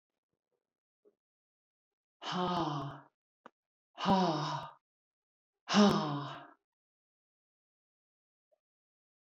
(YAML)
exhalation_length: 9.3 s
exhalation_amplitude: 6785
exhalation_signal_mean_std_ratio: 0.33
survey_phase: beta (2021-08-13 to 2022-03-07)
age: 45-64
gender: Female
wearing_mask: 'No'
symptom_none: true
smoker_status: Never smoked
respiratory_condition_asthma: false
respiratory_condition_other: false
recruitment_source: REACT
submission_delay: 2 days
covid_test_result: Negative
covid_test_method: RT-qPCR